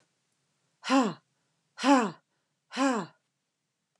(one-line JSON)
{"exhalation_length": "4.0 s", "exhalation_amplitude": 12893, "exhalation_signal_mean_std_ratio": 0.33, "survey_phase": "beta (2021-08-13 to 2022-03-07)", "age": "45-64", "gender": "Female", "wearing_mask": "No", "symptom_none": true, "smoker_status": "Never smoked", "respiratory_condition_asthma": false, "respiratory_condition_other": false, "recruitment_source": "REACT", "submission_delay": "3 days", "covid_test_result": "Negative", "covid_test_method": "RT-qPCR"}